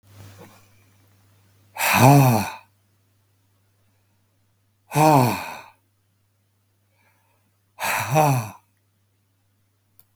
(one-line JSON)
{"exhalation_length": "10.2 s", "exhalation_amplitude": 32768, "exhalation_signal_mean_std_ratio": 0.32, "survey_phase": "beta (2021-08-13 to 2022-03-07)", "age": "65+", "gender": "Male", "wearing_mask": "No", "symptom_cough_any": true, "symptom_headache": true, "symptom_onset": "12 days", "smoker_status": "Ex-smoker", "respiratory_condition_asthma": false, "respiratory_condition_other": true, "recruitment_source": "REACT", "submission_delay": "1 day", "covid_test_result": "Negative", "covid_test_method": "RT-qPCR", "influenza_a_test_result": "Negative", "influenza_b_test_result": "Negative"}